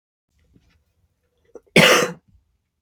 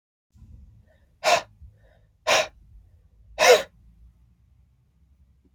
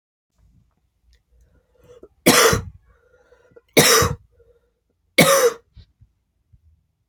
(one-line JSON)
{"cough_length": "2.8 s", "cough_amplitude": 29923, "cough_signal_mean_std_ratio": 0.27, "exhalation_length": "5.5 s", "exhalation_amplitude": 24092, "exhalation_signal_mean_std_ratio": 0.27, "three_cough_length": "7.1 s", "three_cough_amplitude": 32768, "three_cough_signal_mean_std_ratio": 0.32, "survey_phase": "beta (2021-08-13 to 2022-03-07)", "age": "18-44", "gender": "Female", "wearing_mask": "No", "symptom_cough_any": true, "symptom_runny_or_blocked_nose": true, "symptom_sore_throat": true, "symptom_headache": true, "smoker_status": "Ex-smoker", "respiratory_condition_asthma": false, "respiratory_condition_other": false, "recruitment_source": "Test and Trace", "submission_delay": "2 days", "covid_test_result": "Positive", "covid_test_method": "RT-qPCR", "covid_ct_value": 22.0, "covid_ct_gene": "ORF1ab gene"}